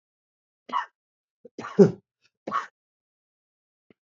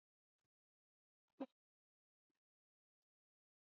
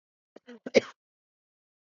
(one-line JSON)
{"three_cough_length": "4.1 s", "three_cough_amplitude": 25903, "three_cough_signal_mean_std_ratio": 0.19, "exhalation_length": "3.7 s", "exhalation_amplitude": 460, "exhalation_signal_mean_std_ratio": 0.09, "cough_length": "1.9 s", "cough_amplitude": 16041, "cough_signal_mean_std_ratio": 0.15, "survey_phase": "beta (2021-08-13 to 2022-03-07)", "age": "45-64", "gender": "Male", "wearing_mask": "No", "symptom_cough_any": true, "symptom_new_continuous_cough": true, "symptom_runny_or_blocked_nose": true, "symptom_shortness_of_breath": true, "symptom_abdominal_pain": true, "symptom_headache": true, "symptom_onset": "5 days", "smoker_status": "Ex-smoker", "respiratory_condition_asthma": false, "respiratory_condition_other": false, "recruitment_source": "Test and Trace", "submission_delay": "2 days", "covid_test_result": "Positive", "covid_test_method": "RT-qPCR", "covid_ct_value": 17.4, "covid_ct_gene": "ORF1ab gene", "covid_ct_mean": 18.5, "covid_viral_load": "850000 copies/ml", "covid_viral_load_category": "Low viral load (10K-1M copies/ml)"}